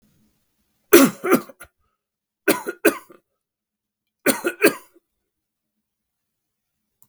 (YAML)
three_cough_length: 7.1 s
three_cough_amplitude: 32768
three_cough_signal_mean_std_ratio: 0.25
survey_phase: beta (2021-08-13 to 2022-03-07)
age: 65+
gender: Male
wearing_mask: 'No'
symptom_none: true
smoker_status: Never smoked
respiratory_condition_asthma: false
respiratory_condition_other: false
recruitment_source: REACT
submission_delay: 3 days
covid_test_result: Negative
covid_test_method: RT-qPCR
influenza_a_test_result: Negative
influenza_b_test_result: Negative